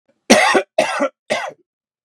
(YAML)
three_cough_length: 2.0 s
three_cough_amplitude: 32768
three_cough_signal_mean_std_ratio: 0.48
survey_phase: beta (2021-08-13 to 2022-03-07)
age: 45-64
gender: Male
wearing_mask: 'No'
symptom_none: true
smoker_status: Never smoked
respiratory_condition_asthma: false
respiratory_condition_other: false
recruitment_source: REACT
submission_delay: 1 day
covid_test_result: Negative
covid_test_method: RT-qPCR